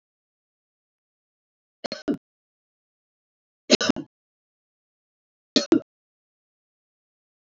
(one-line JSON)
{"three_cough_length": "7.4 s", "three_cough_amplitude": 26664, "three_cough_signal_mean_std_ratio": 0.17, "survey_phase": "beta (2021-08-13 to 2022-03-07)", "age": "65+", "gender": "Female", "wearing_mask": "No", "symptom_none": true, "smoker_status": "Never smoked", "respiratory_condition_asthma": false, "respiratory_condition_other": false, "recruitment_source": "REACT", "submission_delay": "1 day", "covid_test_result": "Negative", "covid_test_method": "RT-qPCR"}